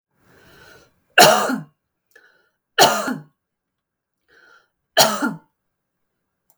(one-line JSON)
{"three_cough_length": "6.6 s", "three_cough_amplitude": 32768, "three_cough_signal_mean_std_ratio": 0.29, "survey_phase": "beta (2021-08-13 to 2022-03-07)", "age": "18-44", "gender": "Female", "wearing_mask": "No", "symptom_none": true, "symptom_onset": "2 days", "smoker_status": "Ex-smoker", "respiratory_condition_asthma": false, "respiratory_condition_other": false, "recruitment_source": "REACT", "submission_delay": "4 days", "covid_test_result": "Negative", "covid_test_method": "RT-qPCR", "influenza_a_test_result": "Negative", "influenza_b_test_result": "Negative"}